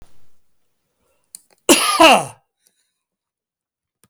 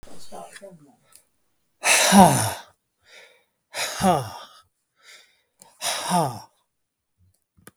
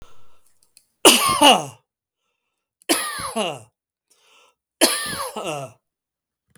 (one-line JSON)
{"cough_length": "4.1 s", "cough_amplitude": 32768, "cough_signal_mean_std_ratio": 0.29, "exhalation_length": "7.8 s", "exhalation_amplitude": 32768, "exhalation_signal_mean_std_ratio": 0.35, "three_cough_length": "6.6 s", "three_cough_amplitude": 32768, "three_cough_signal_mean_std_ratio": 0.35, "survey_phase": "beta (2021-08-13 to 2022-03-07)", "age": "45-64", "gender": "Male", "wearing_mask": "No", "symptom_none": true, "smoker_status": "Never smoked", "respiratory_condition_asthma": false, "respiratory_condition_other": false, "recruitment_source": "REACT", "submission_delay": "2 days", "covid_test_result": "Negative", "covid_test_method": "RT-qPCR", "influenza_a_test_result": "Negative", "influenza_b_test_result": "Negative"}